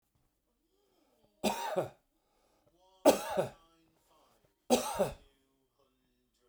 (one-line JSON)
{"three_cough_length": "6.5 s", "three_cough_amplitude": 11072, "three_cough_signal_mean_std_ratio": 0.28, "survey_phase": "beta (2021-08-13 to 2022-03-07)", "age": "45-64", "gender": "Male", "wearing_mask": "No", "symptom_none": true, "smoker_status": "Never smoked", "respiratory_condition_asthma": false, "respiratory_condition_other": false, "recruitment_source": "REACT", "submission_delay": "9 days", "covid_test_result": "Negative", "covid_test_method": "RT-qPCR", "influenza_a_test_result": "Negative", "influenza_b_test_result": "Negative"}